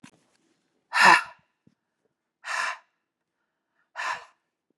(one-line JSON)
{"exhalation_length": "4.8 s", "exhalation_amplitude": 25614, "exhalation_signal_mean_std_ratio": 0.25, "survey_phase": "beta (2021-08-13 to 2022-03-07)", "age": "45-64", "gender": "Female", "wearing_mask": "No", "symptom_cough_any": true, "symptom_runny_or_blocked_nose": true, "symptom_sore_throat": true, "symptom_headache": true, "symptom_onset": "4 days", "smoker_status": "Never smoked", "respiratory_condition_asthma": false, "respiratory_condition_other": false, "recruitment_source": "Test and Trace", "submission_delay": "2 days", "covid_test_result": "Positive", "covid_test_method": "RT-qPCR", "covid_ct_value": 14.7, "covid_ct_gene": "ORF1ab gene"}